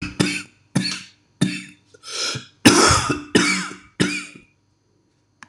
cough_length: 5.5 s
cough_amplitude: 26028
cough_signal_mean_std_ratio: 0.45
survey_phase: beta (2021-08-13 to 2022-03-07)
age: 45-64
gender: Male
wearing_mask: 'No'
symptom_cough_any: true
symptom_new_continuous_cough: true
symptom_runny_or_blocked_nose: true
symptom_shortness_of_breath: true
symptom_sore_throat: true
symptom_fatigue: true
symptom_headache: true
symptom_onset: 3 days
smoker_status: Ex-smoker
respiratory_condition_asthma: false
respiratory_condition_other: false
recruitment_source: Test and Trace
submission_delay: 1 day
covid_test_result: Positive
covid_test_method: RT-qPCR
covid_ct_value: 17.1
covid_ct_gene: N gene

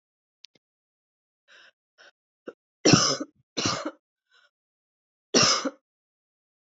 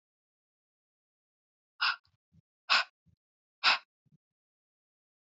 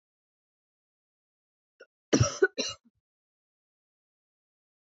three_cough_length: 6.7 s
three_cough_amplitude: 26151
three_cough_signal_mean_std_ratio: 0.27
exhalation_length: 5.4 s
exhalation_amplitude: 10710
exhalation_signal_mean_std_ratio: 0.21
cough_length: 4.9 s
cough_amplitude: 11245
cough_signal_mean_std_ratio: 0.19
survey_phase: alpha (2021-03-01 to 2021-08-12)
age: 18-44
gender: Female
wearing_mask: 'No'
symptom_cough_any: true
symptom_fatigue: true
symptom_headache: true
symptom_onset: 6 days
smoker_status: Never smoked
respiratory_condition_asthma: false
respiratory_condition_other: false
recruitment_source: Test and Trace
submission_delay: 2 days
covid_test_result: Positive
covid_test_method: RT-qPCR
covid_ct_value: 16.5
covid_ct_gene: ORF1ab gene
covid_ct_mean: 16.7
covid_viral_load: 3400000 copies/ml
covid_viral_load_category: High viral load (>1M copies/ml)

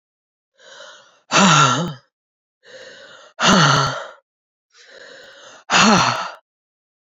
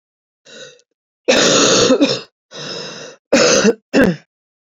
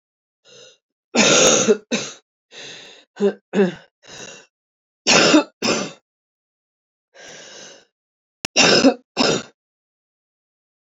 exhalation_length: 7.2 s
exhalation_amplitude: 29735
exhalation_signal_mean_std_ratio: 0.42
cough_length: 4.7 s
cough_amplitude: 32277
cough_signal_mean_std_ratio: 0.53
three_cough_length: 10.9 s
three_cough_amplitude: 32266
three_cough_signal_mean_std_ratio: 0.38
survey_phase: beta (2021-08-13 to 2022-03-07)
age: 18-44
gender: Female
wearing_mask: 'No'
symptom_cough_any: true
symptom_runny_or_blocked_nose: true
symptom_shortness_of_breath: true
symptom_sore_throat: true
symptom_fatigue: true
symptom_headache: true
symptom_other: true
smoker_status: Ex-smoker
respiratory_condition_asthma: true
respiratory_condition_other: false
recruitment_source: Test and Trace
submission_delay: 3 days
covid_test_result: Positive
covid_test_method: RT-qPCR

